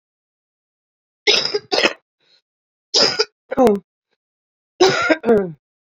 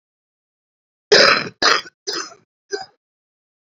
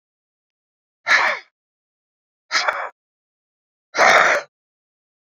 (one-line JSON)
{"three_cough_length": "5.8 s", "three_cough_amplitude": 30753, "three_cough_signal_mean_std_ratio": 0.41, "cough_length": "3.7 s", "cough_amplitude": 30563, "cough_signal_mean_std_ratio": 0.32, "exhalation_length": "5.2 s", "exhalation_amplitude": 32195, "exhalation_signal_mean_std_ratio": 0.34, "survey_phase": "beta (2021-08-13 to 2022-03-07)", "age": "45-64", "gender": "Female", "wearing_mask": "No", "symptom_cough_any": true, "symptom_new_continuous_cough": true, "symptom_runny_or_blocked_nose": true, "symptom_diarrhoea": true, "symptom_fatigue": true, "symptom_headache": true, "symptom_change_to_sense_of_smell_or_taste": true, "symptom_loss_of_taste": true, "symptom_onset": "3 days", "smoker_status": "Current smoker (1 to 10 cigarettes per day)", "respiratory_condition_asthma": false, "respiratory_condition_other": false, "recruitment_source": "Test and Trace", "submission_delay": "1 day", "covid_test_result": "Positive", "covid_test_method": "RT-qPCR", "covid_ct_value": 16.3, "covid_ct_gene": "ORF1ab gene", "covid_ct_mean": 16.9, "covid_viral_load": "2900000 copies/ml", "covid_viral_load_category": "High viral load (>1M copies/ml)"}